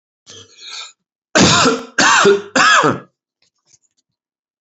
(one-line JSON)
{"three_cough_length": "4.6 s", "three_cough_amplitude": 32077, "three_cough_signal_mean_std_ratio": 0.47, "survey_phase": "beta (2021-08-13 to 2022-03-07)", "age": "45-64", "gender": "Male", "wearing_mask": "No", "symptom_none": true, "smoker_status": "Ex-smoker", "respiratory_condition_asthma": false, "respiratory_condition_other": false, "recruitment_source": "REACT", "submission_delay": "2 days", "covid_test_result": "Negative", "covid_test_method": "RT-qPCR", "influenza_a_test_result": "Negative", "influenza_b_test_result": "Negative"}